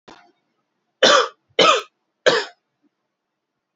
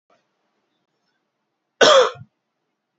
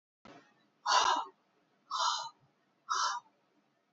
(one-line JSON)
{"three_cough_length": "3.8 s", "three_cough_amplitude": 29210, "three_cough_signal_mean_std_ratio": 0.33, "cough_length": "3.0 s", "cough_amplitude": 32708, "cough_signal_mean_std_ratio": 0.25, "exhalation_length": "3.9 s", "exhalation_amplitude": 6114, "exhalation_signal_mean_std_ratio": 0.42, "survey_phase": "alpha (2021-03-01 to 2021-08-12)", "age": "18-44", "gender": "Male", "wearing_mask": "No", "symptom_fever_high_temperature": true, "symptom_onset": "3 days", "smoker_status": "Never smoked", "respiratory_condition_asthma": false, "respiratory_condition_other": false, "recruitment_source": "Test and Trace", "submission_delay": "2 days", "covid_test_result": "Positive", "covid_test_method": "RT-qPCR", "covid_ct_value": 12.3, "covid_ct_gene": "ORF1ab gene", "covid_ct_mean": 12.7, "covid_viral_load": "67000000 copies/ml", "covid_viral_load_category": "High viral load (>1M copies/ml)"}